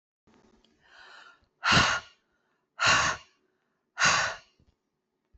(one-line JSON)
{"exhalation_length": "5.4 s", "exhalation_amplitude": 11074, "exhalation_signal_mean_std_ratio": 0.37, "survey_phase": "beta (2021-08-13 to 2022-03-07)", "age": "45-64", "gender": "Female", "wearing_mask": "No", "symptom_cough_any": true, "symptom_runny_or_blocked_nose": true, "symptom_onset": "6 days", "smoker_status": "Never smoked", "respiratory_condition_asthma": false, "respiratory_condition_other": false, "recruitment_source": "REACT", "submission_delay": "2 days", "covid_test_result": "Negative", "covid_test_method": "RT-qPCR"}